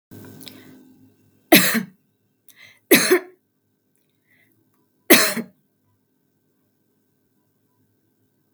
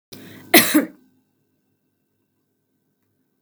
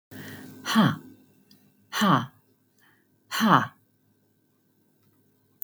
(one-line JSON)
{"three_cough_length": "8.5 s", "three_cough_amplitude": 32768, "three_cough_signal_mean_std_ratio": 0.24, "cough_length": "3.4 s", "cough_amplitude": 32768, "cough_signal_mean_std_ratio": 0.23, "exhalation_length": "5.6 s", "exhalation_amplitude": 22683, "exhalation_signal_mean_std_ratio": 0.33, "survey_phase": "beta (2021-08-13 to 2022-03-07)", "age": "65+", "gender": "Female", "wearing_mask": "No", "symptom_none": true, "smoker_status": "Never smoked", "respiratory_condition_asthma": false, "respiratory_condition_other": false, "recruitment_source": "REACT", "submission_delay": "2 days", "covid_test_result": "Negative", "covid_test_method": "RT-qPCR", "influenza_a_test_result": "Unknown/Void", "influenza_b_test_result": "Unknown/Void"}